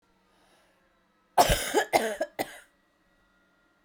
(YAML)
cough_length: 3.8 s
cough_amplitude: 17717
cough_signal_mean_std_ratio: 0.33
survey_phase: beta (2021-08-13 to 2022-03-07)
age: 18-44
gender: Female
wearing_mask: 'No'
symptom_cough_any: true
symptom_new_continuous_cough: true
symptom_fatigue: true
symptom_headache: true
symptom_onset: 4 days
smoker_status: Never smoked
respiratory_condition_asthma: false
respiratory_condition_other: false
recruitment_source: Test and Trace
submission_delay: 2 days
covid_test_result: Positive
covid_test_method: RT-qPCR